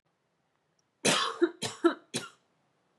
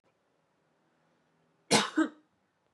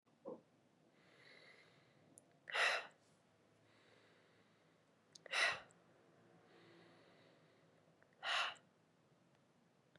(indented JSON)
{
  "three_cough_length": "3.0 s",
  "three_cough_amplitude": 10496,
  "three_cough_signal_mean_std_ratio": 0.35,
  "cough_length": "2.7 s",
  "cough_amplitude": 10181,
  "cough_signal_mean_std_ratio": 0.25,
  "exhalation_length": "10.0 s",
  "exhalation_amplitude": 1936,
  "exhalation_signal_mean_std_ratio": 0.3,
  "survey_phase": "beta (2021-08-13 to 2022-03-07)",
  "age": "18-44",
  "gender": "Female",
  "wearing_mask": "No",
  "symptom_runny_or_blocked_nose": true,
  "symptom_sore_throat": true,
  "symptom_onset": "2 days",
  "smoker_status": "Never smoked",
  "respiratory_condition_asthma": false,
  "respiratory_condition_other": false,
  "recruitment_source": "Test and Trace",
  "submission_delay": "2 days",
  "covid_test_result": "Positive",
  "covid_test_method": "RT-qPCR",
  "covid_ct_value": 24.2,
  "covid_ct_gene": "N gene"
}